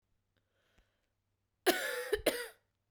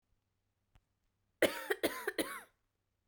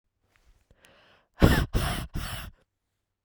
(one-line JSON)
{"cough_length": "2.9 s", "cough_amplitude": 7390, "cough_signal_mean_std_ratio": 0.33, "three_cough_length": "3.1 s", "three_cough_amplitude": 5675, "three_cough_signal_mean_std_ratio": 0.31, "exhalation_length": "3.2 s", "exhalation_amplitude": 28063, "exhalation_signal_mean_std_ratio": 0.33, "survey_phase": "beta (2021-08-13 to 2022-03-07)", "age": "18-44", "gender": "Female", "wearing_mask": "Yes", "symptom_cough_any": true, "symptom_runny_or_blocked_nose": true, "symptom_sore_throat": true, "symptom_fatigue": true, "symptom_change_to_sense_of_smell_or_taste": true, "smoker_status": "Never smoked", "respiratory_condition_asthma": false, "respiratory_condition_other": false, "recruitment_source": "Test and Trace", "submission_delay": "1 day", "covid_test_result": "Positive", "covid_test_method": "RT-qPCR", "covid_ct_value": 18.2, "covid_ct_gene": "ORF1ab gene", "covid_ct_mean": 19.2, "covid_viral_load": "520000 copies/ml", "covid_viral_load_category": "Low viral load (10K-1M copies/ml)"}